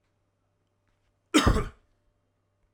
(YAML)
cough_length: 2.7 s
cough_amplitude: 15529
cough_signal_mean_std_ratio: 0.26
survey_phase: alpha (2021-03-01 to 2021-08-12)
age: 45-64
gender: Male
wearing_mask: 'No'
symptom_none: true
smoker_status: Ex-smoker
respiratory_condition_asthma: false
respiratory_condition_other: false
recruitment_source: REACT
submission_delay: 2 days
covid_test_result: Negative
covid_test_method: RT-qPCR